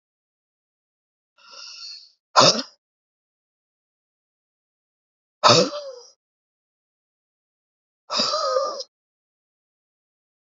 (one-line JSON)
{"exhalation_length": "10.4 s", "exhalation_amplitude": 30634, "exhalation_signal_mean_std_ratio": 0.25, "survey_phase": "beta (2021-08-13 to 2022-03-07)", "age": "18-44", "gender": "Male", "wearing_mask": "No", "symptom_none": true, "smoker_status": "Never smoked", "respiratory_condition_asthma": false, "respiratory_condition_other": false, "recruitment_source": "Test and Trace", "submission_delay": "0 days", "covid_test_result": "Negative", "covid_test_method": "LFT"}